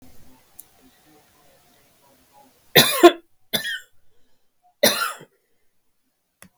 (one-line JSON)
{"three_cough_length": "6.6 s", "three_cough_amplitude": 32768, "three_cough_signal_mean_std_ratio": 0.23, "survey_phase": "beta (2021-08-13 to 2022-03-07)", "age": "65+", "gender": "Female", "wearing_mask": "No", "symptom_none": true, "smoker_status": "Ex-smoker", "respiratory_condition_asthma": true, "respiratory_condition_other": false, "recruitment_source": "REACT", "submission_delay": "1 day", "covid_test_result": "Negative", "covid_test_method": "RT-qPCR", "influenza_a_test_result": "Negative", "influenza_b_test_result": "Negative"}